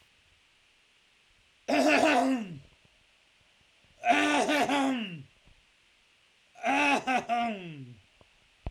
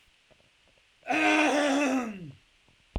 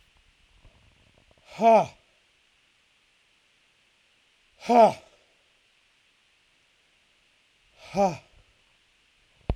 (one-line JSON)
{"three_cough_length": "8.7 s", "three_cough_amplitude": 8576, "three_cough_signal_mean_std_ratio": 0.51, "cough_length": "3.0 s", "cough_amplitude": 6757, "cough_signal_mean_std_ratio": 0.56, "exhalation_length": "9.6 s", "exhalation_amplitude": 16699, "exhalation_signal_mean_std_ratio": 0.23, "survey_phase": "alpha (2021-03-01 to 2021-08-12)", "age": "18-44", "gender": "Male", "wearing_mask": "No", "symptom_none": true, "smoker_status": "Never smoked", "respiratory_condition_asthma": false, "respiratory_condition_other": false, "recruitment_source": "Test and Trace", "submission_delay": "2 days", "covid_test_result": "Positive", "covid_test_method": "RT-qPCR"}